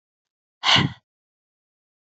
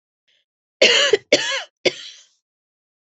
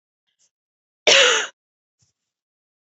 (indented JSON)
{
  "exhalation_length": "2.1 s",
  "exhalation_amplitude": 24272,
  "exhalation_signal_mean_std_ratio": 0.27,
  "three_cough_length": "3.1 s",
  "three_cough_amplitude": 31977,
  "three_cough_signal_mean_std_ratio": 0.36,
  "cough_length": "2.9 s",
  "cough_amplitude": 29722,
  "cough_signal_mean_std_ratio": 0.28,
  "survey_phase": "beta (2021-08-13 to 2022-03-07)",
  "age": "18-44",
  "gender": "Female",
  "wearing_mask": "No",
  "symptom_runny_or_blocked_nose": true,
  "symptom_sore_throat": true,
  "symptom_fatigue": true,
  "symptom_headache": true,
  "symptom_other": true,
  "smoker_status": "Never smoked",
  "respiratory_condition_asthma": false,
  "respiratory_condition_other": false,
  "recruitment_source": "Test and Trace",
  "submission_delay": "1 day",
  "covid_test_result": "Positive",
  "covid_test_method": "LFT"
}